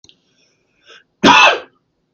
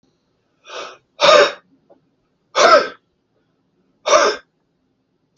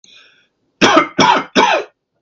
{
  "cough_length": "2.1 s",
  "cough_amplitude": 32768,
  "cough_signal_mean_std_ratio": 0.33,
  "exhalation_length": "5.4 s",
  "exhalation_amplitude": 32768,
  "exhalation_signal_mean_std_ratio": 0.33,
  "three_cough_length": "2.2 s",
  "three_cough_amplitude": 32768,
  "three_cough_signal_mean_std_ratio": 0.5,
  "survey_phase": "beta (2021-08-13 to 2022-03-07)",
  "age": "18-44",
  "gender": "Male",
  "wearing_mask": "No",
  "symptom_cough_any": true,
  "symptom_runny_or_blocked_nose": true,
  "symptom_sore_throat": true,
  "symptom_headache": true,
  "smoker_status": "Never smoked",
  "respiratory_condition_asthma": false,
  "respiratory_condition_other": false,
  "recruitment_source": "REACT",
  "submission_delay": "3 days",
  "covid_test_result": "Positive",
  "covid_test_method": "RT-qPCR",
  "covid_ct_value": 27.2,
  "covid_ct_gene": "E gene",
  "influenza_a_test_result": "Negative",
  "influenza_b_test_result": "Negative"
}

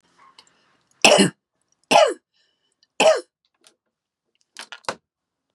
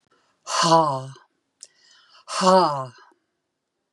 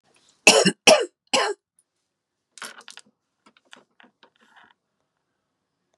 {
  "three_cough_length": "5.5 s",
  "three_cough_amplitude": 32768,
  "three_cough_signal_mean_std_ratio": 0.28,
  "exhalation_length": "3.9 s",
  "exhalation_amplitude": 23566,
  "exhalation_signal_mean_std_ratio": 0.41,
  "cough_length": "6.0 s",
  "cough_amplitude": 32768,
  "cough_signal_mean_std_ratio": 0.23,
  "survey_phase": "beta (2021-08-13 to 2022-03-07)",
  "age": "65+",
  "gender": "Female",
  "wearing_mask": "No",
  "symptom_none": true,
  "smoker_status": "Ex-smoker",
  "respiratory_condition_asthma": false,
  "respiratory_condition_other": false,
  "recruitment_source": "REACT",
  "submission_delay": "1 day",
  "covid_test_result": "Negative",
  "covid_test_method": "RT-qPCR",
  "influenza_a_test_result": "Negative",
  "influenza_b_test_result": "Negative"
}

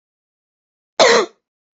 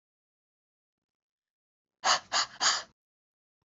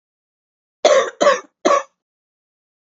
{
  "cough_length": "1.8 s",
  "cough_amplitude": 30690,
  "cough_signal_mean_std_ratio": 0.31,
  "exhalation_length": "3.7 s",
  "exhalation_amplitude": 8339,
  "exhalation_signal_mean_std_ratio": 0.28,
  "three_cough_length": "3.0 s",
  "three_cough_amplitude": 29018,
  "three_cough_signal_mean_std_ratio": 0.35,
  "survey_phase": "beta (2021-08-13 to 2022-03-07)",
  "age": "18-44",
  "gender": "Female",
  "wearing_mask": "No",
  "symptom_cough_any": true,
  "symptom_new_continuous_cough": true,
  "symptom_runny_or_blocked_nose": true,
  "symptom_fatigue": true,
  "symptom_headache": true,
  "symptom_other": true,
  "symptom_onset": "3 days",
  "smoker_status": "Never smoked",
  "respiratory_condition_asthma": false,
  "respiratory_condition_other": false,
  "recruitment_source": "Test and Trace",
  "submission_delay": "1 day",
  "covid_test_result": "Positive",
  "covid_test_method": "RT-qPCR",
  "covid_ct_value": 22.5,
  "covid_ct_gene": "ORF1ab gene"
}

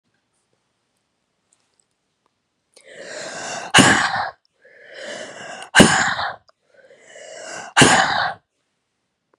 {
  "exhalation_length": "9.4 s",
  "exhalation_amplitude": 32768,
  "exhalation_signal_mean_std_ratio": 0.35,
  "survey_phase": "beta (2021-08-13 to 2022-03-07)",
  "age": "45-64",
  "gender": "Female",
  "wearing_mask": "No",
  "symptom_cough_any": true,
  "symptom_runny_or_blocked_nose": true,
  "symptom_sore_throat": true,
  "symptom_fatigue": true,
  "symptom_headache": true,
  "symptom_change_to_sense_of_smell_or_taste": true,
  "symptom_loss_of_taste": true,
  "symptom_onset": "2 days",
  "smoker_status": "Never smoked",
  "respiratory_condition_asthma": false,
  "respiratory_condition_other": false,
  "recruitment_source": "Test and Trace",
  "submission_delay": "2 days",
  "covid_test_result": "Positive",
  "covid_test_method": "RT-qPCR",
  "covid_ct_value": 26.3,
  "covid_ct_gene": "ORF1ab gene"
}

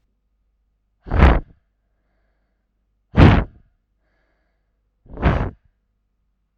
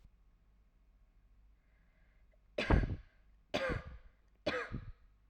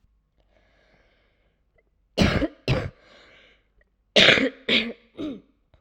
{
  "exhalation_length": "6.6 s",
  "exhalation_amplitude": 32768,
  "exhalation_signal_mean_std_ratio": 0.27,
  "three_cough_length": "5.3 s",
  "three_cough_amplitude": 5263,
  "three_cough_signal_mean_std_ratio": 0.35,
  "cough_length": "5.8 s",
  "cough_amplitude": 32767,
  "cough_signal_mean_std_ratio": 0.33,
  "survey_phase": "alpha (2021-03-01 to 2021-08-12)",
  "age": "18-44",
  "gender": "Female",
  "wearing_mask": "No",
  "symptom_cough_any": true,
  "symptom_shortness_of_breath": true,
  "symptom_abdominal_pain": true,
  "symptom_fatigue": true,
  "symptom_headache": true,
  "smoker_status": "Ex-smoker",
  "respiratory_condition_asthma": false,
  "respiratory_condition_other": false,
  "recruitment_source": "Test and Trace",
  "submission_delay": "1 day",
  "covid_test_result": "Positive",
  "covid_test_method": "RT-qPCR",
  "covid_ct_value": 23.9,
  "covid_ct_gene": "ORF1ab gene",
  "covid_ct_mean": 24.4,
  "covid_viral_load": "10000 copies/ml",
  "covid_viral_load_category": "Low viral load (10K-1M copies/ml)"
}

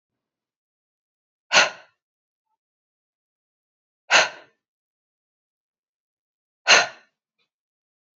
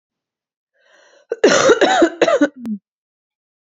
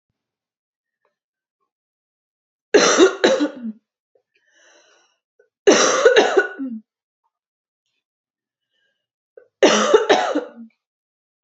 {
  "exhalation_length": "8.2 s",
  "exhalation_amplitude": 29990,
  "exhalation_signal_mean_std_ratio": 0.19,
  "cough_length": "3.7 s",
  "cough_amplitude": 28234,
  "cough_signal_mean_std_ratio": 0.44,
  "three_cough_length": "11.4 s",
  "three_cough_amplitude": 30628,
  "three_cough_signal_mean_std_ratio": 0.35,
  "survey_phase": "beta (2021-08-13 to 2022-03-07)",
  "age": "18-44",
  "gender": "Female",
  "wearing_mask": "No",
  "symptom_cough_any": true,
  "symptom_runny_or_blocked_nose": true,
  "symptom_shortness_of_breath": true,
  "symptom_fatigue": true,
  "symptom_onset": "7 days",
  "smoker_status": "Ex-smoker",
  "respiratory_condition_asthma": false,
  "respiratory_condition_other": false,
  "recruitment_source": "REACT",
  "submission_delay": "2 days",
  "covid_test_result": "Positive",
  "covid_test_method": "RT-qPCR",
  "covid_ct_value": 21.7,
  "covid_ct_gene": "E gene",
  "influenza_a_test_result": "Negative",
  "influenza_b_test_result": "Negative"
}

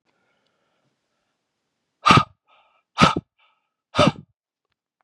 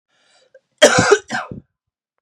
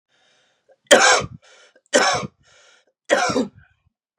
{
  "exhalation_length": "5.0 s",
  "exhalation_amplitude": 32681,
  "exhalation_signal_mean_std_ratio": 0.24,
  "cough_length": "2.2 s",
  "cough_amplitude": 32768,
  "cough_signal_mean_std_ratio": 0.34,
  "three_cough_length": "4.2 s",
  "three_cough_amplitude": 32768,
  "three_cough_signal_mean_std_ratio": 0.37,
  "survey_phase": "beta (2021-08-13 to 2022-03-07)",
  "age": "18-44",
  "gender": "Male",
  "wearing_mask": "No",
  "symptom_cough_any": true,
  "symptom_runny_or_blocked_nose": true,
  "symptom_sore_throat": true,
  "symptom_fatigue": true,
  "symptom_headache": true,
  "symptom_onset": "3 days",
  "smoker_status": "Never smoked",
  "respiratory_condition_asthma": true,
  "respiratory_condition_other": false,
  "recruitment_source": "Test and Trace",
  "submission_delay": "2 days",
  "covid_test_result": "Positive",
  "covid_test_method": "RT-qPCR",
  "covid_ct_value": 27.2,
  "covid_ct_gene": "ORF1ab gene"
}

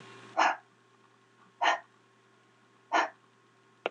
{
  "exhalation_length": "3.9 s",
  "exhalation_amplitude": 7784,
  "exhalation_signal_mean_std_ratio": 0.32,
  "survey_phase": "alpha (2021-03-01 to 2021-08-12)",
  "age": "45-64",
  "gender": "Female",
  "wearing_mask": "No",
  "symptom_fatigue": true,
  "symptom_onset": "12 days",
  "smoker_status": "Ex-smoker",
  "respiratory_condition_asthma": false,
  "respiratory_condition_other": false,
  "recruitment_source": "REACT",
  "submission_delay": "1 day",
  "covid_test_result": "Negative",
  "covid_test_method": "RT-qPCR"
}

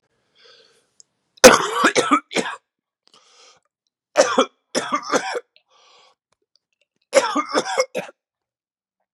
{
  "three_cough_length": "9.1 s",
  "three_cough_amplitude": 32768,
  "three_cough_signal_mean_std_ratio": 0.32,
  "survey_phase": "beta (2021-08-13 to 2022-03-07)",
  "age": "18-44",
  "gender": "Male",
  "wearing_mask": "No",
  "symptom_cough_any": true,
  "symptom_new_continuous_cough": true,
  "symptom_runny_or_blocked_nose": true,
  "symptom_sore_throat": true,
  "symptom_fever_high_temperature": true,
  "symptom_onset": "5 days",
  "smoker_status": "Never smoked",
  "respiratory_condition_asthma": false,
  "respiratory_condition_other": false,
  "recruitment_source": "Test and Trace",
  "submission_delay": "3 days",
  "covid_test_result": "Positive",
  "covid_test_method": "RT-qPCR",
  "covid_ct_value": 18.3,
  "covid_ct_gene": "N gene"
}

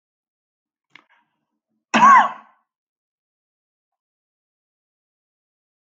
{
  "cough_length": "6.0 s",
  "cough_amplitude": 27016,
  "cough_signal_mean_std_ratio": 0.2,
  "survey_phase": "alpha (2021-03-01 to 2021-08-12)",
  "age": "65+",
  "gender": "Male",
  "wearing_mask": "No",
  "symptom_none": true,
  "smoker_status": "Never smoked",
  "respiratory_condition_asthma": false,
  "respiratory_condition_other": false,
  "recruitment_source": "REACT",
  "submission_delay": "1 day",
  "covid_test_result": "Negative",
  "covid_test_method": "RT-qPCR"
}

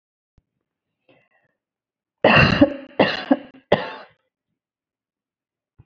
{
  "three_cough_length": "5.9 s",
  "three_cough_amplitude": 28680,
  "three_cough_signal_mean_std_ratio": 0.28,
  "survey_phase": "beta (2021-08-13 to 2022-03-07)",
  "age": "45-64",
  "gender": "Female",
  "wearing_mask": "No",
  "symptom_none": true,
  "smoker_status": "Never smoked",
  "respiratory_condition_asthma": false,
  "respiratory_condition_other": false,
  "recruitment_source": "REACT",
  "submission_delay": "1 day",
  "covid_test_result": "Negative",
  "covid_test_method": "RT-qPCR",
  "influenza_a_test_result": "Negative",
  "influenza_b_test_result": "Negative"
}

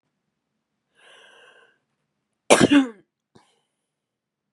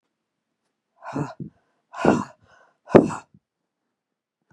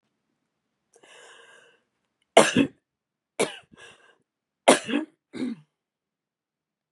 {
  "cough_length": "4.5 s",
  "cough_amplitude": 32559,
  "cough_signal_mean_std_ratio": 0.21,
  "exhalation_length": "4.5 s",
  "exhalation_amplitude": 32768,
  "exhalation_signal_mean_std_ratio": 0.23,
  "three_cough_length": "6.9 s",
  "three_cough_amplitude": 31004,
  "three_cough_signal_mean_std_ratio": 0.22,
  "survey_phase": "beta (2021-08-13 to 2022-03-07)",
  "age": "45-64",
  "gender": "Female",
  "wearing_mask": "No",
  "symptom_cough_any": true,
  "symptom_shortness_of_breath": true,
  "symptom_onset": "12 days",
  "smoker_status": "Never smoked",
  "respiratory_condition_asthma": true,
  "respiratory_condition_other": false,
  "recruitment_source": "REACT",
  "submission_delay": "6 days",
  "covid_test_result": "Negative",
  "covid_test_method": "RT-qPCR"
}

